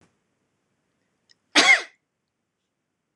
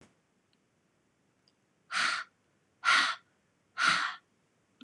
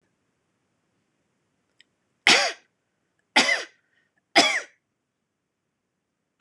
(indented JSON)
{
  "cough_length": "3.2 s",
  "cough_amplitude": 26027,
  "cough_signal_mean_std_ratio": 0.22,
  "exhalation_length": "4.8 s",
  "exhalation_amplitude": 7894,
  "exhalation_signal_mean_std_ratio": 0.35,
  "three_cough_length": "6.4 s",
  "three_cough_amplitude": 25753,
  "three_cough_signal_mean_std_ratio": 0.25,
  "survey_phase": "beta (2021-08-13 to 2022-03-07)",
  "age": "45-64",
  "gender": "Female",
  "wearing_mask": "No",
  "symptom_none": true,
  "smoker_status": "Never smoked",
  "respiratory_condition_asthma": false,
  "respiratory_condition_other": false,
  "recruitment_source": "REACT",
  "submission_delay": "2 days",
  "covid_test_result": "Negative",
  "covid_test_method": "RT-qPCR"
}